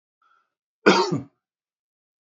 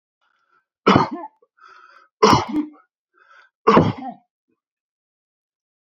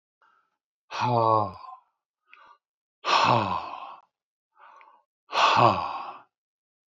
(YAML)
cough_length: 2.4 s
cough_amplitude: 31394
cough_signal_mean_std_ratio: 0.27
three_cough_length: 5.8 s
three_cough_amplitude: 28693
three_cough_signal_mean_std_ratio: 0.3
exhalation_length: 6.9 s
exhalation_amplitude: 17999
exhalation_signal_mean_std_ratio: 0.41
survey_phase: beta (2021-08-13 to 2022-03-07)
age: 65+
gender: Male
wearing_mask: 'No'
symptom_none: true
smoker_status: Ex-smoker
respiratory_condition_asthma: false
respiratory_condition_other: false
recruitment_source: REACT
submission_delay: 1 day
covid_test_result: Negative
covid_test_method: RT-qPCR
influenza_a_test_result: Negative
influenza_b_test_result: Negative